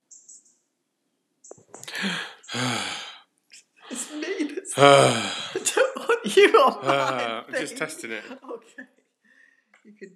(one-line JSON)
{"exhalation_length": "10.2 s", "exhalation_amplitude": 30408, "exhalation_signal_mean_std_ratio": 0.43, "survey_phase": "beta (2021-08-13 to 2022-03-07)", "age": "65+", "gender": "Female", "wearing_mask": "No", "symptom_none": true, "smoker_status": "Never smoked", "respiratory_condition_asthma": false, "respiratory_condition_other": false, "recruitment_source": "REACT", "submission_delay": "16 days", "covid_test_result": "Negative", "covid_test_method": "RT-qPCR"}